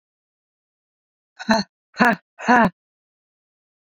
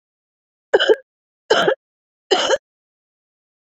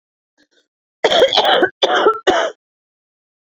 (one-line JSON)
{"exhalation_length": "3.9 s", "exhalation_amplitude": 27349, "exhalation_signal_mean_std_ratio": 0.29, "three_cough_length": "3.7 s", "three_cough_amplitude": 27237, "three_cough_signal_mean_std_ratio": 0.33, "cough_length": "3.5 s", "cough_amplitude": 30164, "cough_signal_mean_std_ratio": 0.48, "survey_phase": "beta (2021-08-13 to 2022-03-07)", "age": "45-64", "gender": "Female", "wearing_mask": "No", "symptom_cough_any": true, "symptom_runny_or_blocked_nose": true, "symptom_fatigue": true, "symptom_change_to_sense_of_smell_or_taste": true, "symptom_loss_of_taste": true, "symptom_onset": "10 days", "smoker_status": "Never smoked", "respiratory_condition_asthma": false, "respiratory_condition_other": false, "recruitment_source": "Test and Trace", "submission_delay": "2 days", "covid_test_result": "Positive", "covid_test_method": "RT-qPCR"}